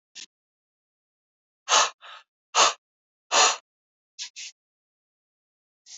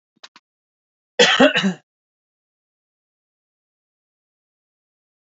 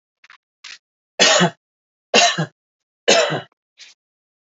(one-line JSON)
{"exhalation_length": "6.0 s", "exhalation_amplitude": 19636, "exhalation_signal_mean_std_ratio": 0.26, "cough_length": "5.2 s", "cough_amplitude": 29471, "cough_signal_mean_std_ratio": 0.23, "three_cough_length": "4.5 s", "three_cough_amplitude": 31351, "three_cough_signal_mean_std_ratio": 0.36, "survey_phase": "beta (2021-08-13 to 2022-03-07)", "age": "18-44", "gender": "Male", "wearing_mask": "No", "symptom_none": true, "symptom_onset": "11 days", "smoker_status": "Never smoked", "respiratory_condition_asthma": false, "respiratory_condition_other": false, "recruitment_source": "REACT", "submission_delay": "20 days", "covid_test_result": "Negative", "covid_test_method": "RT-qPCR"}